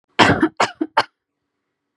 {"three_cough_length": "2.0 s", "three_cough_amplitude": 32767, "three_cough_signal_mean_std_ratio": 0.36, "survey_phase": "beta (2021-08-13 to 2022-03-07)", "age": "18-44", "gender": "Female", "wearing_mask": "No", "symptom_none": true, "smoker_status": "Never smoked", "respiratory_condition_asthma": false, "respiratory_condition_other": false, "recruitment_source": "Test and Trace", "submission_delay": "1 day", "covid_test_result": "Negative", "covid_test_method": "RT-qPCR"}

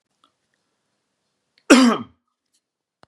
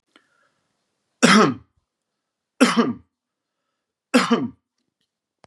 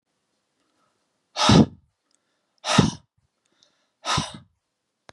{"cough_length": "3.1 s", "cough_amplitude": 32767, "cough_signal_mean_std_ratio": 0.24, "three_cough_length": "5.5 s", "three_cough_amplitude": 32767, "three_cough_signal_mean_std_ratio": 0.31, "exhalation_length": "5.1 s", "exhalation_amplitude": 28911, "exhalation_signal_mean_std_ratio": 0.27, "survey_phase": "beta (2021-08-13 to 2022-03-07)", "age": "45-64", "gender": "Male", "wearing_mask": "No", "symptom_none": true, "symptom_onset": "7 days", "smoker_status": "Never smoked", "respiratory_condition_asthma": false, "respiratory_condition_other": false, "recruitment_source": "REACT", "submission_delay": "1 day", "covid_test_result": "Negative", "covid_test_method": "RT-qPCR", "influenza_a_test_result": "Negative", "influenza_b_test_result": "Negative"}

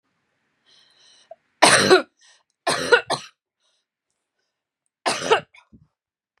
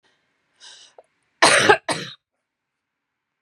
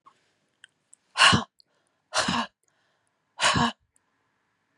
{"three_cough_length": "6.4 s", "three_cough_amplitude": 32768, "three_cough_signal_mean_std_ratio": 0.29, "cough_length": "3.4 s", "cough_amplitude": 32029, "cough_signal_mean_std_ratio": 0.28, "exhalation_length": "4.8 s", "exhalation_amplitude": 21693, "exhalation_signal_mean_std_ratio": 0.31, "survey_phase": "beta (2021-08-13 to 2022-03-07)", "age": "45-64", "gender": "Female", "wearing_mask": "No", "symptom_none": true, "symptom_onset": "12 days", "smoker_status": "Ex-smoker", "respiratory_condition_asthma": false, "respiratory_condition_other": false, "recruitment_source": "REACT", "submission_delay": "4 days", "covid_test_result": "Negative", "covid_test_method": "RT-qPCR", "influenza_a_test_result": "Negative", "influenza_b_test_result": "Negative"}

